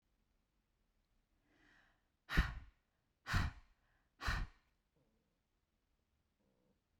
exhalation_length: 7.0 s
exhalation_amplitude: 3955
exhalation_signal_mean_std_ratio: 0.25
survey_phase: beta (2021-08-13 to 2022-03-07)
age: 45-64
gender: Female
wearing_mask: 'No'
symptom_none: true
smoker_status: Never smoked
respiratory_condition_asthma: false
respiratory_condition_other: false
recruitment_source: REACT
submission_delay: 1 day
covid_test_result: Negative
covid_test_method: RT-qPCR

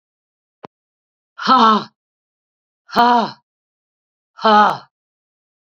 exhalation_length: 5.6 s
exhalation_amplitude: 31812
exhalation_signal_mean_std_ratio: 0.34
survey_phase: beta (2021-08-13 to 2022-03-07)
age: 65+
gender: Female
wearing_mask: 'No'
symptom_none: true
smoker_status: Current smoker (11 or more cigarettes per day)
respiratory_condition_asthma: false
respiratory_condition_other: false
recruitment_source: Test and Trace
submission_delay: 1 day
covid_test_result: Positive
covid_test_method: RT-qPCR
covid_ct_value: 24.7
covid_ct_gene: N gene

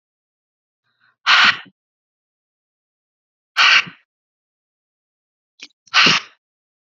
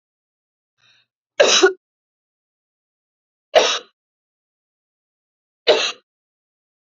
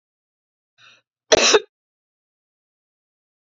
exhalation_length: 6.9 s
exhalation_amplitude: 32740
exhalation_signal_mean_std_ratio: 0.27
three_cough_length: 6.8 s
three_cough_amplitude: 28965
three_cough_signal_mean_std_ratio: 0.25
cough_length: 3.6 s
cough_amplitude: 28003
cough_signal_mean_std_ratio: 0.21
survey_phase: beta (2021-08-13 to 2022-03-07)
age: 45-64
gender: Female
wearing_mask: 'No'
symptom_fatigue: true
smoker_status: Never smoked
respiratory_condition_asthma: false
respiratory_condition_other: false
recruitment_source: REACT
submission_delay: 1 day
covid_test_result: Negative
covid_test_method: RT-qPCR
influenza_a_test_result: Unknown/Void
influenza_b_test_result: Unknown/Void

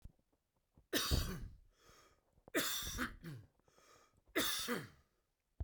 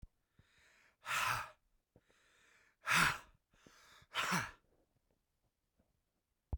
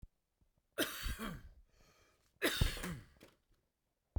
three_cough_length: 5.6 s
three_cough_amplitude: 3358
three_cough_signal_mean_std_ratio: 0.46
exhalation_length: 6.6 s
exhalation_amplitude: 4080
exhalation_signal_mean_std_ratio: 0.32
cough_length: 4.2 s
cough_amplitude: 4508
cough_signal_mean_std_ratio: 0.39
survey_phase: beta (2021-08-13 to 2022-03-07)
age: 65+
gender: Male
wearing_mask: 'No'
symptom_none: true
smoker_status: Ex-smoker
respiratory_condition_asthma: true
respiratory_condition_other: false
recruitment_source: REACT
submission_delay: 14 days
covid_test_result: Negative
covid_test_method: RT-qPCR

